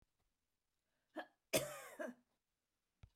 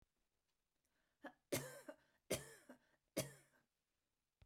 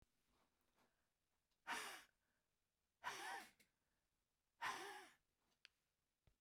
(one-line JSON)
{"cough_length": "3.2 s", "cough_amplitude": 2521, "cough_signal_mean_std_ratio": 0.27, "three_cough_length": "4.5 s", "three_cough_amplitude": 1360, "three_cough_signal_mean_std_ratio": 0.28, "exhalation_length": "6.4 s", "exhalation_amplitude": 700, "exhalation_signal_mean_std_ratio": 0.35, "survey_phase": "beta (2021-08-13 to 2022-03-07)", "age": "65+", "gender": "Female", "wearing_mask": "No", "symptom_none": true, "smoker_status": "Never smoked", "respiratory_condition_asthma": false, "respiratory_condition_other": false, "recruitment_source": "REACT", "submission_delay": "7 days", "covid_test_result": "Negative", "covid_test_method": "RT-qPCR", "influenza_a_test_result": "Negative", "influenza_b_test_result": "Negative"}